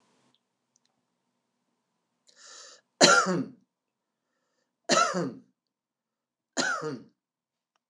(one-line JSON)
{"three_cough_length": "7.9 s", "three_cough_amplitude": 22299, "three_cough_signal_mean_std_ratio": 0.28, "survey_phase": "beta (2021-08-13 to 2022-03-07)", "age": "65+", "gender": "Male", "wearing_mask": "No", "symptom_none": true, "smoker_status": "Ex-smoker", "respiratory_condition_asthma": false, "respiratory_condition_other": false, "recruitment_source": "REACT", "submission_delay": "3 days", "covid_test_result": "Negative", "covid_test_method": "RT-qPCR", "influenza_a_test_result": "Negative", "influenza_b_test_result": "Negative"}